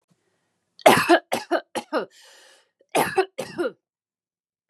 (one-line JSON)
{"cough_length": "4.7 s", "cough_amplitude": 29799, "cough_signal_mean_std_ratio": 0.34, "survey_phase": "beta (2021-08-13 to 2022-03-07)", "age": "45-64", "gender": "Female", "wearing_mask": "No", "symptom_headache": true, "smoker_status": "Ex-smoker", "respiratory_condition_asthma": false, "respiratory_condition_other": false, "recruitment_source": "REACT", "submission_delay": "2 days", "covid_test_result": "Negative", "covid_test_method": "RT-qPCR", "influenza_a_test_result": "Negative", "influenza_b_test_result": "Negative"}